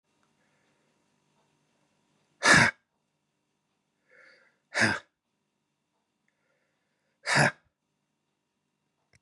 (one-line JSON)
{"exhalation_length": "9.2 s", "exhalation_amplitude": 15239, "exhalation_signal_mean_std_ratio": 0.21, "survey_phase": "beta (2021-08-13 to 2022-03-07)", "age": "45-64", "gender": "Male", "wearing_mask": "No", "symptom_cough_any": true, "symptom_sore_throat": true, "symptom_headache": true, "symptom_onset": "6 days", "smoker_status": "Never smoked", "respiratory_condition_asthma": false, "respiratory_condition_other": false, "recruitment_source": "Test and Trace", "submission_delay": "2 days", "covid_test_result": "Negative", "covid_test_method": "RT-qPCR"}